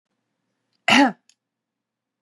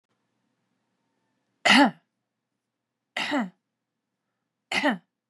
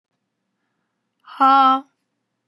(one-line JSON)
{"cough_length": "2.2 s", "cough_amplitude": 25704, "cough_signal_mean_std_ratio": 0.26, "three_cough_length": "5.3 s", "three_cough_amplitude": 18057, "three_cough_signal_mean_std_ratio": 0.28, "exhalation_length": "2.5 s", "exhalation_amplitude": 20742, "exhalation_signal_mean_std_ratio": 0.33, "survey_phase": "beta (2021-08-13 to 2022-03-07)", "age": "45-64", "gender": "Female", "wearing_mask": "No", "symptom_none": true, "smoker_status": "Never smoked", "respiratory_condition_asthma": true, "respiratory_condition_other": false, "recruitment_source": "REACT", "submission_delay": "2 days", "covid_test_result": "Negative", "covid_test_method": "RT-qPCR", "influenza_a_test_result": "Negative", "influenza_b_test_result": "Negative"}